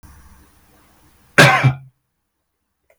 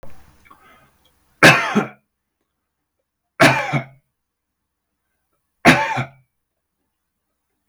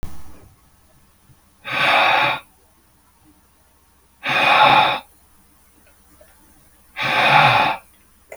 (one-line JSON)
{"cough_length": "3.0 s", "cough_amplitude": 32768, "cough_signal_mean_std_ratio": 0.28, "three_cough_length": "7.7 s", "three_cough_amplitude": 32768, "three_cough_signal_mean_std_ratio": 0.28, "exhalation_length": "8.4 s", "exhalation_amplitude": 29841, "exhalation_signal_mean_std_ratio": 0.46, "survey_phase": "beta (2021-08-13 to 2022-03-07)", "age": "45-64", "gender": "Male", "wearing_mask": "No", "symptom_none": true, "smoker_status": "Ex-smoker", "respiratory_condition_asthma": true, "respiratory_condition_other": false, "recruitment_source": "REACT", "submission_delay": "2 days", "covid_test_result": "Negative", "covid_test_method": "RT-qPCR", "influenza_a_test_result": "Negative", "influenza_b_test_result": "Negative"}